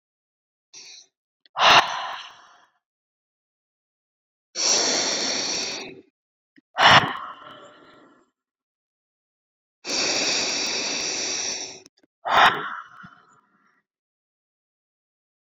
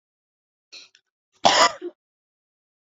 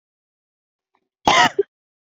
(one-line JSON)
{"exhalation_length": "15.4 s", "exhalation_amplitude": 29883, "exhalation_signal_mean_std_ratio": 0.38, "three_cough_length": "2.9 s", "three_cough_amplitude": 27490, "three_cough_signal_mean_std_ratio": 0.24, "cough_length": "2.1 s", "cough_amplitude": 29481, "cough_signal_mean_std_ratio": 0.28, "survey_phase": "beta (2021-08-13 to 2022-03-07)", "age": "18-44", "gender": "Female", "wearing_mask": "No", "symptom_none": true, "smoker_status": "Never smoked", "respiratory_condition_asthma": false, "respiratory_condition_other": false, "recruitment_source": "REACT", "submission_delay": "2 days", "covid_test_result": "Negative", "covid_test_method": "RT-qPCR"}